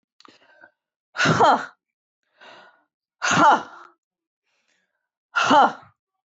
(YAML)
exhalation_length: 6.4 s
exhalation_amplitude: 19083
exhalation_signal_mean_std_ratio: 0.35
survey_phase: beta (2021-08-13 to 2022-03-07)
age: 45-64
gender: Female
wearing_mask: 'No'
symptom_sore_throat: true
smoker_status: Never smoked
respiratory_condition_asthma: false
respiratory_condition_other: false
recruitment_source: Test and Trace
submission_delay: 1 day
covid_test_result: Positive
covid_test_method: RT-qPCR
covid_ct_value: 18.8
covid_ct_gene: ORF1ab gene
covid_ct_mean: 19.3
covid_viral_load: 480000 copies/ml
covid_viral_load_category: Low viral load (10K-1M copies/ml)